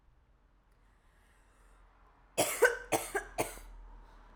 {"cough_length": "4.4 s", "cough_amplitude": 9237, "cough_signal_mean_std_ratio": 0.33, "survey_phase": "alpha (2021-03-01 to 2021-08-12)", "age": "18-44", "gender": "Female", "wearing_mask": "No", "symptom_cough_any": true, "symptom_abdominal_pain": true, "symptom_fatigue": true, "symptom_fever_high_temperature": true, "symptom_headache": true, "smoker_status": "Never smoked", "respiratory_condition_asthma": false, "respiratory_condition_other": false, "recruitment_source": "Test and Trace", "submission_delay": "2 days", "covid_test_result": "Positive", "covid_test_method": "RT-qPCR", "covid_ct_value": 23.8, "covid_ct_gene": "ORF1ab gene", "covid_ct_mean": 24.4, "covid_viral_load": "9800 copies/ml", "covid_viral_load_category": "Minimal viral load (< 10K copies/ml)"}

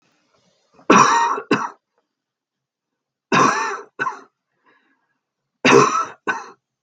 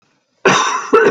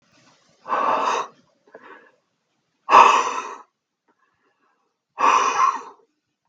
{"three_cough_length": "6.8 s", "three_cough_amplitude": 32768, "three_cough_signal_mean_std_ratio": 0.38, "cough_length": "1.1 s", "cough_amplitude": 32768, "cough_signal_mean_std_ratio": 0.64, "exhalation_length": "6.5 s", "exhalation_amplitude": 32768, "exhalation_signal_mean_std_ratio": 0.38, "survey_phase": "beta (2021-08-13 to 2022-03-07)", "age": "65+", "gender": "Male", "wearing_mask": "No", "symptom_cough_any": true, "symptom_sore_throat": true, "smoker_status": "Ex-smoker", "respiratory_condition_asthma": false, "respiratory_condition_other": false, "recruitment_source": "REACT", "submission_delay": "1 day", "covid_test_result": "Negative", "covid_test_method": "RT-qPCR", "influenza_a_test_result": "Negative", "influenza_b_test_result": "Negative"}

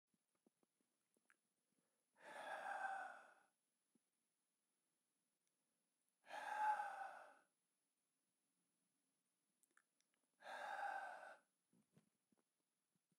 {"exhalation_length": "13.2 s", "exhalation_amplitude": 780, "exhalation_signal_mean_std_ratio": 0.35, "survey_phase": "beta (2021-08-13 to 2022-03-07)", "age": "45-64", "gender": "Male", "wearing_mask": "No", "symptom_cough_any": true, "symptom_runny_or_blocked_nose": true, "symptom_change_to_sense_of_smell_or_taste": true, "symptom_loss_of_taste": true, "smoker_status": "Never smoked", "respiratory_condition_asthma": false, "respiratory_condition_other": false, "recruitment_source": "Test and Trace", "submission_delay": "2 days", "covid_test_result": "Positive", "covid_test_method": "RT-qPCR", "covid_ct_value": 15.5, "covid_ct_gene": "ORF1ab gene", "covid_ct_mean": 17.1, "covid_viral_load": "2500000 copies/ml", "covid_viral_load_category": "High viral load (>1M copies/ml)"}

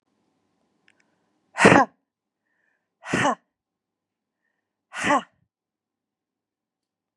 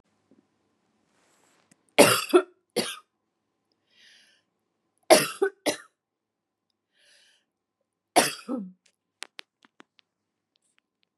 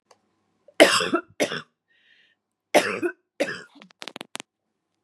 {"exhalation_length": "7.2 s", "exhalation_amplitude": 30172, "exhalation_signal_mean_std_ratio": 0.23, "three_cough_length": "11.2 s", "three_cough_amplitude": 30272, "three_cough_signal_mean_std_ratio": 0.22, "cough_length": "5.0 s", "cough_amplitude": 32767, "cough_signal_mean_std_ratio": 0.29, "survey_phase": "beta (2021-08-13 to 2022-03-07)", "age": "45-64", "gender": "Female", "wearing_mask": "No", "symptom_none": true, "smoker_status": "Ex-smoker", "respiratory_condition_asthma": false, "respiratory_condition_other": false, "recruitment_source": "REACT", "submission_delay": "3 days", "covid_test_result": "Negative", "covid_test_method": "RT-qPCR", "influenza_a_test_result": "Unknown/Void", "influenza_b_test_result": "Unknown/Void"}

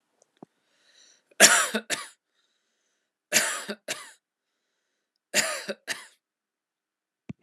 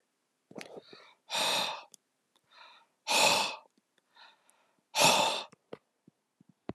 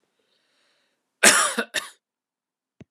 {"three_cough_length": "7.4 s", "three_cough_amplitude": 30162, "three_cough_signal_mean_std_ratio": 0.26, "exhalation_length": "6.7 s", "exhalation_amplitude": 9328, "exhalation_signal_mean_std_ratio": 0.37, "cough_length": "2.9 s", "cough_amplitude": 32472, "cough_signal_mean_std_ratio": 0.27, "survey_phase": "beta (2021-08-13 to 2022-03-07)", "age": "18-44", "gender": "Male", "wearing_mask": "No", "symptom_runny_or_blocked_nose": true, "symptom_sore_throat": true, "symptom_onset": "13 days", "smoker_status": "Ex-smoker", "respiratory_condition_asthma": false, "respiratory_condition_other": false, "recruitment_source": "REACT", "submission_delay": "2 days", "covid_test_result": "Negative", "covid_test_method": "RT-qPCR", "influenza_a_test_result": "Negative", "influenza_b_test_result": "Negative"}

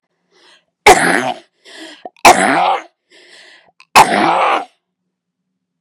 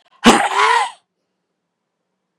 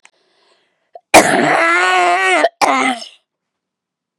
{"three_cough_length": "5.8 s", "three_cough_amplitude": 32768, "three_cough_signal_mean_std_ratio": 0.41, "exhalation_length": "2.4 s", "exhalation_amplitude": 32768, "exhalation_signal_mean_std_ratio": 0.39, "cough_length": "4.2 s", "cough_amplitude": 32768, "cough_signal_mean_std_ratio": 0.52, "survey_phase": "beta (2021-08-13 to 2022-03-07)", "age": "45-64", "gender": "Female", "wearing_mask": "No", "symptom_cough_any": true, "symptom_runny_or_blocked_nose": true, "symptom_shortness_of_breath": true, "symptom_fatigue": true, "symptom_onset": "13 days", "smoker_status": "Never smoked", "respiratory_condition_asthma": true, "respiratory_condition_other": false, "recruitment_source": "REACT", "submission_delay": "2 days", "covid_test_result": "Negative", "covid_test_method": "RT-qPCR", "influenza_a_test_result": "Negative", "influenza_b_test_result": "Negative"}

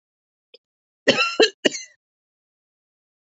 {"cough_length": "3.2 s", "cough_amplitude": 28406, "cough_signal_mean_std_ratio": 0.26, "survey_phase": "alpha (2021-03-01 to 2021-08-12)", "age": "45-64", "gender": "Female", "wearing_mask": "No", "symptom_none": true, "smoker_status": "Ex-smoker", "respiratory_condition_asthma": false, "respiratory_condition_other": false, "recruitment_source": "REACT", "submission_delay": "1 day", "covid_test_result": "Negative", "covid_test_method": "RT-qPCR"}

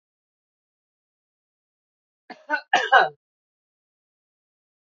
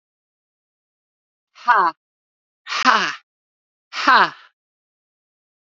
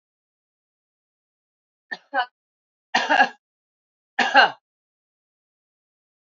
{"cough_length": "4.9 s", "cough_amplitude": 25018, "cough_signal_mean_std_ratio": 0.2, "exhalation_length": "5.7 s", "exhalation_amplitude": 28801, "exhalation_signal_mean_std_ratio": 0.3, "three_cough_length": "6.4 s", "three_cough_amplitude": 26364, "three_cough_signal_mean_std_ratio": 0.24, "survey_phase": "beta (2021-08-13 to 2022-03-07)", "age": "65+", "gender": "Female", "wearing_mask": "No", "symptom_none": true, "smoker_status": "Current smoker (1 to 10 cigarettes per day)", "respiratory_condition_asthma": false, "respiratory_condition_other": false, "recruitment_source": "REACT", "submission_delay": "1 day", "covid_test_result": "Negative", "covid_test_method": "RT-qPCR", "influenza_a_test_result": "Negative", "influenza_b_test_result": "Negative"}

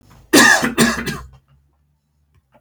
{"cough_length": "2.6 s", "cough_amplitude": 32768, "cough_signal_mean_std_ratio": 0.41, "survey_phase": "beta (2021-08-13 to 2022-03-07)", "age": "45-64", "gender": "Male", "wearing_mask": "No", "symptom_runny_or_blocked_nose": true, "smoker_status": "Never smoked", "respiratory_condition_asthma": false, "respiratory_condition_other": false, "recruitment_source": "REACT", "submission_delay": "6 days", "covid_test_result": "Negative", "covid_test_method": "RT-qPCR"}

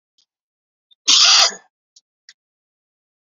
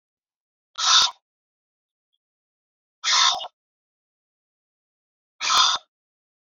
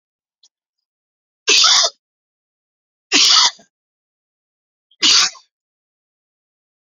{"cough_length": "3.3 s", "cough_amplitude": 32768, "cough_signal_mean_std_ratio": 0.29, "exhalation_length": "6.5 s", "exhalation_amplitude": 23226, "exhalation_signal_mean_std_ratio": 0.31, "three_cough_length": "6.9 s", "three_cough_amplitude": 32768, "three_cough_signal_mean_std_ratio": 0.32, "survey_phase": "alpha (2021-03-01 to 2021-08-12)", "age": "45-64", "gender": "Male", "wearing_mask": "No", "symptom_cough_any": true, "symptom_fatigue": true, "symptom_headache": true, "symptom_onset": "7 days", "smoker_status": "Never smoked", "respiratory_condition_asthma": false, "respiratory_condition_other": false, "recruitment_source": "Test and Trace", "submission_delay": "2 days", "covid_test_result": "Positive", "covid_test_method": "RT-qPCR", "covid_ct_value": 18.8, "covid_ct_gene": "ORF1ab gene"}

